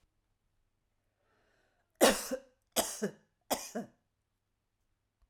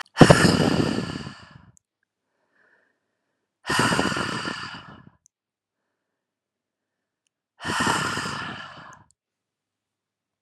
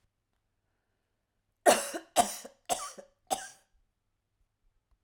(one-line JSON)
{"three_cough_length": "5.3 s", "three_cough_amplitude": 10004, "three_cough_signal_mean_std_ratio": 0.25, "exhalation_length": "10.4 s", "exhalation_amplitude": 32768, "exhalation_signal_mean_std_ratio": 0.34, "cough_length": "5.0 s", "cough_amplitude": 12134, "cough_signal_mean_std_ratio": 0.24, "survey_phase": "alpha (2021-03-01 to 2021-08-12)", "age": "45-64", "gender": "Female", "wearing_mask": "No", "symptom_none": true, "smoker_status": "Ex-smoker", "respiratory_condition_asthma": false, "respiratory_condition_other": false, "recruitment_source": "REACT", "submission_delay": "1 day", "covid_test_result": "Negative", "covid_test_method": "RT-qPCR"}